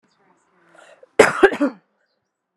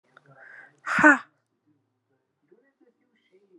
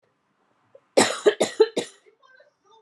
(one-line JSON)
{"cough_length": "2.6 s", "cough_amplitude": 32768, "cough_signal_mean_std_ratio": 0.26, "exhalation_length": "3.6 s", "exhalation_amplitude": 28349, "exhalation_signal_mean_std_ratio": 0.21, "three_cough_length": "2.8 s", "three_cough_amplitude": 22013, "three_cough_signal_mean_std_ratio": 0.3, "survey_phase": "beta (2021-08-13 to 2022-03-07)", "age": "18-44", "gender": "Female", "wearing_mask": "No", "symptom_none": true, "smoker_status": "Never smoked", "respiratory_condition_asthma": true, "respiratory_condition_other": false, "recruitment_source": "REACT", "submission_delay": "7 days", "covid_test_result": "Negative", "covid_test_method": "RT-qPCR", "influenza_a_test_result": "Negative", "influenza_b_test_result": "Negative"}